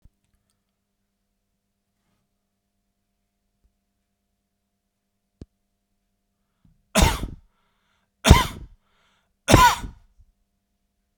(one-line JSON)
{"three_cough_length": "11.2 s", "three_cough_amplitude": 32768, "three_cough_signal_mean_std_ratio": 0.19, "survey_phase": "beta (2021-08-13 to 2022-03-07)", "age": "45-64", "gender": "Male", "wearing_mask": "No", "symptom_none": true, "smoker_status": "Never smoked", "respiratory_condition_asthma": false, "respiratory_condition_other": false, "recruitment_source": "REACT", "submission_delay": "1 day", "covid_test_result": "Negative", "covid_test_method": "RT-qPCR"}